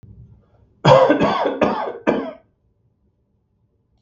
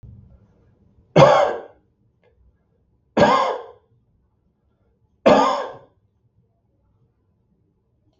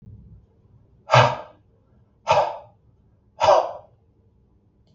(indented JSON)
{
  "cough_length": "4.0 s",
  "cough_amplitude": 32768,
  "cough_signal_mean_std_ratio": 0.42,
  "three_cough_length": "8.2 s",
  "three_cough_amplitude": 32768,
  "three_cough_signal_mean_std_ratio": 0.3,
  "exhalation_length": "4.9 s",
  "exhalation_amplitude": 32192,
  "exhalation_signal_mean_std_ratio": 0.32,
  "survey_phase": "beta (2021-08-13 to 2022-03-07)",
  "age": "45-64",
  "gender": "Male",
  "wearing_mask": "No",
  "symptom_none": true,
  "smoker_status": "Ex-smoker",
  "respiratory_condition_asthma": true,
  "respiratory_condition_other": false,
  "recruitment_source": "REACT",
  "submission_delay": "1 day",
  "covid_test_result": "Negative",
  "covid_test_method": "RT-qPCR"
}